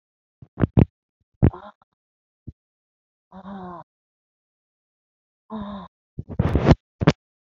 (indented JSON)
{
  "exhalation_length": "7.6 s",
  "exhalation_amplitude": 27326,
  "exhalation_signal_mean_std_ratio": 0.23,
  "survey_phase": "beta (2021-08-13 to 2022-03-07)",
  "age": "65+",
  "gender": "Female",
  "wearing_mask": "No",
  "symptom_cough_any": true,
  "symptom_runny_or_blocked_nose": true,
  "symptom_sore_throat": true,
  "symptom_fatigue": true,
  "symptom_headache": true,
  "symptom_change_to_sense_of_smell_or_taste": true,
  "symptom_loss_of_taste": true,
  "smoker_status": "Ex-smoker",
  "respiratory_condition_asthma": false,
  "respiratory_condition_other": false,
  "recruitment_source": "Test and Trace",
  "submission_delay": "1 day",
  "covid_test_result": "Positive",
  "covid_test_method": "RT-qPCR",
  "covid_ct_value": 12.1,
  "covid_ct_gene": "N gene",
  "covid_ct_mean": 12.4,
  "covid_viral_load": "89000000 copies/ml",
  "covid_viral_load_category": "High viral load (>1M copies/ml)"
}